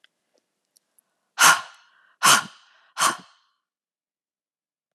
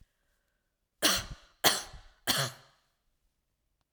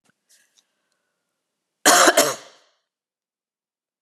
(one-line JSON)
{"exhalation_length": "4.9 s", "exhalation_amplitude": 26507, "exhalation_signal_mean_std_ratio": 0.25, "three_cough_length": "3.9 s", "three_cough_amplitude": 15542, "three_cough_signal_mean_std_ratio": 0.31, "cough_length": "4.0 s", "cough_amplitude": 32352, "cough_signal_mean_std_ratio": 0.26, "survey_phase": "alpha (2021-03-01 to 2021-08-12)", "age": "45-64", "gender": "Female", "wearing_mask": "No", "symptom_cough_any": true, "symptom_onset": "10 days", "smoker_status": "Never smoked", "respiratory_condition_asthma": false, "respiratory_condition_other": false, "recruitment_source": "REACT", "submission_delay": "1 day", "covid_test_result": "Negative", "covid_test_method": "RT-qPCR"}